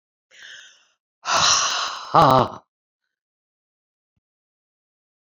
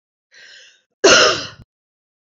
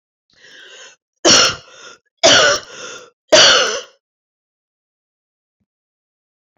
{"exhalation_length": "5.2 s", "exhalation_amplitude": 30088, "exhalation_signal_mean_std_ratio": 0.33, "cough_length": "2.4 s", "cough_amplitude": 32456, "cough_signal_mean_std_ratio": 0.32, "three_cough_length": "6.6 s", "three_cough_amplitude": 32528, "three_cough_signal_mean_std_ratio": 0.35, "survey_phase": "beta (2021-08-13 to 2022-03-07)", "age": "65+", "gender": "Female", "wearing_mask": "No", "symptom_fatigue": true, "symptom_fever_high_temperature": true, "symptom_headache": true, "symptom_other": true, "smoker_status": "Never smoked", "respiratory_condition_asthma": false, "respiratory_condition_other": false, "recruitment_source": "Test and Trace", "submission_delay": "1 day", "covid_test_result": "Positive", "covid_test_method": "RT-qPCR"}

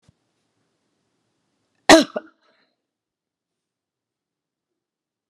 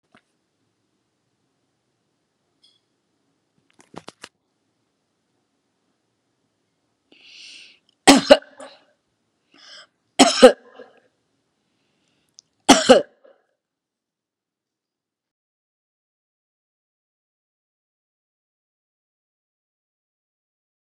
{"cough_length": "5.3 s", "cough_amplitude": 32768, "cough_signal_mean_std_ratio": 0.13, "three_cough_length": "20.9 s", "three_cough_amplitude": 32768, "three_cough_signal_mean_std_ratio": 0.14, "survey_phase": "beta (2021-08-13 to 2022-03-07)", "age": "45-64", "gender": "Female", "wearing_mask": "No", "symptom_none": true, "smoker_status": "Never smoked", "respiratory_condition_asthma": false, "respiratory_condition_other": false, "recruitment_source": "REACT", "submission_delay": "3 days", "covid_test_result": "Negative", "covid_test_method": "RT-qPCR"}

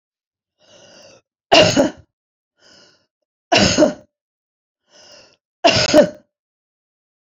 {"three_cough_length": "7.3 s", "three_cough_amplitude": 32767, "three_cough_signal_mean_std_ratio": 0.32, "survey_phase": "beta (2021-08-13 to 2022-03-07)", "age": "65+", "gender": "Female", "wearing_mask": "No", "symptom_none": true, "smoker_status": "Ex-smoker", "respiratory_condition_asthma": false, "respiratory_condition_other": false, "recruitment_source": "REACT", "submission_delay": "2 days", "covid_test_result": "Negative", "covid_test_method": "RT-qPCR"}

